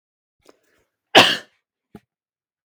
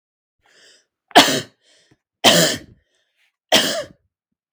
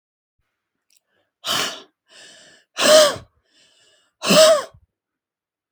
{"cough_length": "2.6 s", "cough_amplitude": 32766, "cough_signal_mean_std_ratio": 0.2, "three_cough_length": "4.5 s", "three_cough_amplitude": 32768, "three_cough_signal_mean_std_ratio": 0.32, "exhalation_length": "5.7 s", "exhalation_amplitude": 31554, "exhalation_signal_mean_std_ratio": 0.32, "survey_phase": "beta (2021-08-13 to 2022-03-07)", "age": "18-44", "gender": "Female", "wearing_mask": "No", "symptom_none": true, "smoker_status": "Never smoked", "respiratory_condition_asthma": false, "respiratory_condition_other": false, "recruitment_source": "REACT", "submission_delay": "4 days", "covid_test_result": "Negative", "covid_test_method": "RT-qPCR", "influenza_a_test_result": "Negative", "influenza_b_test_result": "Negative"}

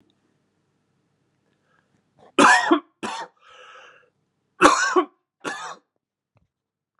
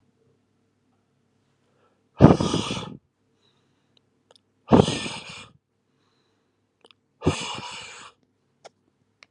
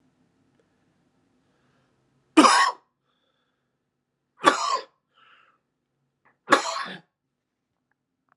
{"cough_length": "7.0 s", "cough_amplitude": 32767, "cough_signal_mean_std_ratio": 0.29, "exhalation_length": "9.3 s", "exhalation_amplitude": 32768, "exhalation_signal_mean_std_ratio": 0.23, "three_cough_length": "8.4 s", "three_cough_amplitude": 32765, "three_cough_signal_mean_std_ratio": 0.24, "survey_phase": "alpha (2021-03-01 to 2021-08-12)", "age": "18-44", "gender": "Male", "wearing_mask": "No", "symptom_cough_any": true, "symptom_abdominal_pain": true, "symptom_diarrhoea": true, "symptom_fatigue": true, "symptom_headache": true, "symptom_change_to_sense_of_smell_or_taste": true, "symptom_loss_of_taste": true, "symptom_onset": "3 days", "smoker_status": "Never smoked", "respiratory_condition_asthma": false, "respiratory_condition_other": false, "recruitment_source": "Test and Trace", "submission_delay": "2 days", "covid_test_result": "Positive", "covid_test_method": "RT-qPCR", "covid_ct_value": 13.4, "covid_ct_gene": "N gene", "covid_ct_mean": 14.1, "covid_viral_load": "23000000 copies/ml", "covid_viral_load_category": "High viral load (>1M copies/ml)"}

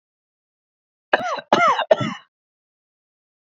{"three_cough_length": "3.5 s", "three_cough_amplitude": 27501, "three_cough_signal_mean_std_ratio": 0.33, "survey_phase": "beta (2021-08-13 to 2022-03-07)", "age": "18-44", "gender": "Male", "wearing_mask": "No", "symptom_fever_high_temperature": true, "symptom_headache": true, "symptom_onset": "3 days", "smoker_status": "Never smoked", "respiratory_condition_asthma": true, "respiratory_condition_other": false, "recruitment_source": "REACT", "submission_delay": "1 day", "covid_test_result": "Negative", "covid_test_method": "RT-qPCR"}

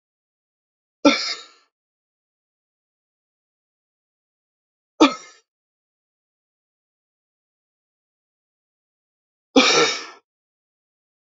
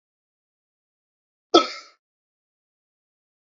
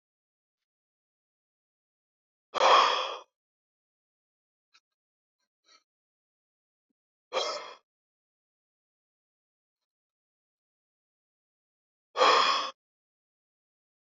{"three_cough_length": "11.3 s", "three_cough_amplitude": 28761, "three_cough_signal_mean_std_ratio": 0.19, "cough_length": "3.6 s", "cough_amplitude": 28288, "cough_signal_mean_std_ratio": 0.14, "exhalation_length": "14.2 s", "exhalation_amplitude": 12696, "exhalation_signal_mean_std_ratio": 0.22, "survey_phase": "beta (2021-08-13 to 2022-03-07)", "age": "18-44", "gender": "Male", "wearing_mask": "No", "symptom_sore_throat": true, "symptom_headache": true, "smoker_status": "Current smoker (1 to 10 cigarettes per day)", "respiratory_condition_asthma": true, "respiratory_condition_other": false, "recruitment_source": "Test and Trace", "submission_delay": "2 days", "covid_test_result": "Positive", "covid_test_method": "RT-qPCR", "covid_ct_value": 18.9, "covid_ct_gene": "ORF1ab gene", "covid_ct_mean": 19.6, "covid_viral_load": "370000 copies/ml", "covid_viral_load_category": "Low viral load (10K-1M copies/ml)"}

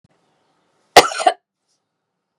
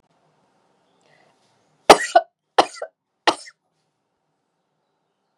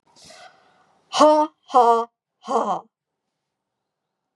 {"cough_length": "2.4 s", "cough_amplitude": 32768, "cough_signal_mean_std_ratio": 0.21, "three_cough_length": "5.4 s", "three_cough_amplitude": 32768, "three_cough_signal_mean_std_ratio": 0.17, "exhalation_length": "4.4 s", "exhalation_amplitude": 28442, "exhalation_signal_mean_std_ratio": 0.36, "survey_phase": "beta (2021-08-13 to 2022-03-07)", "age": "65+", "gender": "Female", "wearing_mask": "No", "symptom_none": true, "smoker_status": "Never smoked", "respiratory_condition_asthma": false, "respiratory_condition_other": false, "recruitment_source": "REACT", "submission_delay": "6 days", "covid_test_result": "Negative", "covid_test_method": "RT-qPCR", "influenza_a_test_result": "Negative", "influenza_b_test_result": "Negative"}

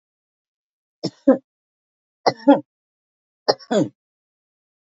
{"three_cough_length": "4.9 s", "three_cough_amplitude": 28120, "three_cough_signal_mean_std_ratio": 0.23, "survey_phase": "beta (2021-08-13 to 2022-03-07)", "age": "65+", "gender": "Female", "wearing_mask": "No", "symptom_none": true, "smoker_status": "Never smoked", "respiratory_condition_asthma": true, "respiratory_condition_other": false, "recruitment_source": "REACT", "submission_delay": "2 days", "covid_test_result": "Negative", "covid_test_method": "RT-qPCR", "influenza_a_test_result": "Negative", "influenza_b_test_result": "Negative"}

